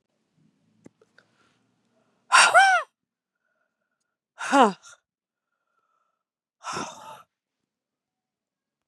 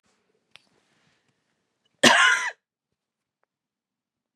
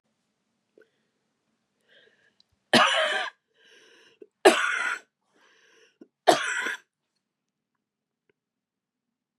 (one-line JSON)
{"exhalation_length": "8.9 s", "exhalation_amplitude": 25250, "exhalation_signal_mean_std_ratio": 0.23, "cough_length": "4.4 s", "cough_amplitude": 29752, "cough_signal_mean_std_ratio": 0.24, "three_cough_length": "9.4 s", "three_cough_amplitude": 25534, "three_cough_signal_mean_std_ratio": 0.27, "survey_phase": "beta (2021-08-13 to 2022-03-07)", "age": "45-64", "gender": "Female", "wearing_mask": "No", "symptom_runny_or_blocked_nose": true, "symptom_sore_throat": true, "symptom_fatigue": true, "symptom_fever_high_temperature": true, "symptom_headache": true, "smoker_status": "Current smoker (1 to 10 cigarettes per day)", "respiratory_condition_asthma": false, "respiratory_condition_other": false, "recruitment_source": "Test and Trace", "submission_delay": "1 day", "covid_test_result": "Positive", "covid_test_method": "LFT"}